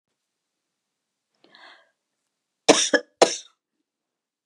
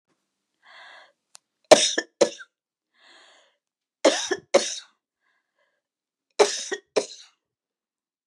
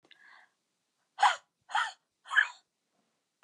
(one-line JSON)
{"cough_length": "4.5 s", "cough_amplitude": 31845, "cough_signal_mean_std_ratio": 0.19, "three_cough_length": "8.3 s", "three_cough_amplitude": 32767, "three_cough_signal_mean_std_ratio": 0.24, "exhalation_length": "3.4 s", "exhalation_amplitude": 8592, "exhalation_signal_mean_std_ratio": 0.27, "survey_phase": "beta (2021-08-13 to 2022-03-07)", "age": "65+", "gender": "Female", "wearing_mask": "No", "symptom_none": true, "smoker_status": "Never smoked", "respiratory_condition_asthma": false, "respiratory_condition_other": false, "recruitment_source": "REACT", "submission_delay": "2 days", "covid_test_result": "Negative", "covid_test_method": "RT-qPCR", "influenza_a_test_result": "Negative", "influenza_b_test_result": "Negative"}